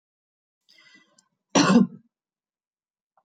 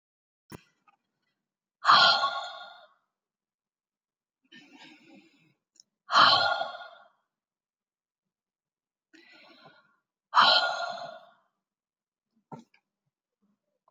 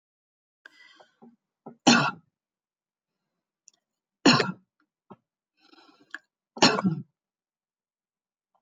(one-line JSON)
{"cough_length": "3.2 s", "cough_amplitude": 14772, "cough_signal_mean_std_ratio": 0.25, "exhalation_length": "13.9 s", "exhalation_amplitude": 15801, "exhalation_signal_mean_std_ratio": 0.27, "three_cough_length": "8.6 s", "three_cough_amplitude": 16316, "three_cough_signal_mean_std_ratio": 0.23, "survey_phase": "beta (2021-08-13 to 2022-03-07)", "age": "45-64", "gender": "Female", "wearing_mask": "No", "symptom_none": true, "smoker_status": "Never smoked", "respiratory_condition_asthma": false, "respiratory_condition_other": false, "recruitment_source": "REACT", "submission_delay": "0 days", "covid_test_result": "Negative", "covid_test_method": "RT-qPCR"}